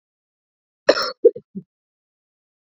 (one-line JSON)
{"cough_length": "2.7 s", "cough_amplitude": 27498, "cough_signal_mean_std_ratio": 0.2, "survey_phase": "beta (2021-08-13 to 2022-03-07)", "age": "45-64", "gender": "Female", "wearing_mask": "Yes", "symptom_cough_any": true, "symptom_new_continuous_cough": true, "symptom_sore_throat": true, "symptom_headache": true, "symptom_change_to_sense_of_smell_or_taste": true, "symptom_loss_of_taste": true, "symptom_onset": "4 days", "smoker_status": "Ex-smoker", "respiratory_condition_asthma": false, "respiratory_condition_other": false, "recruitment_source": "Test and Trace", "submission_delay": "2 days", "covid_test_result": "Positive", "covid_test_method": "RT-qPCR", "covid_ct_value": 18.3, "covid_ct_gene": "ORF1ab gene"}